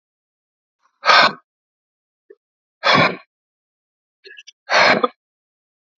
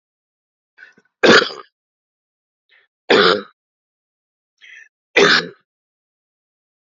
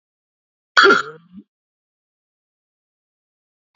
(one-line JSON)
{"exhalation_length": "6.0 s", "exhalation_amplitude": 32768, "exhalation_signal_mean_std_ratio": 0.31, "three_cough_length": "7.0 s", "three_cough_amplitude": 32768, "three_cough_signal_mean_std_ratio": 0.27, "cough_length": "3.8 s", "cough_amplitude": 32768, "cough_signal_mean_std_ratio": 0.21, "survey_phase": "beta (2021-08-13 to 2022-03-07)", "age": "45-64", "gender": "Male", "wearing_mask": "No", "symptom_cough_any": true, "symptom_runny_or_blocked_nose": true, "symptom_fever_high_temperature": true, "symptom_headache": true, "symptom_change_to_sense_of_smell_or_taste": true, "symptom_onset": "5 days", "smoker_status": "Never smoked", "respiratory_condition_asthma": false, "respiratory_condition_other": false, "recruitment_source": "Test and Trace", "submission_delay": "2 days", "covid_test_result": "Positive", "covid_test_method": "RT-qPCR", "covid_ct_value": 13.3, "covid_ct_gene": "ORF1ab gene", "covid_ct_mean": 13.7, "covid_viral_load": "31000000 copies/ml", "covid_viral_load_category": "High viral load (>1M copies/ml)"}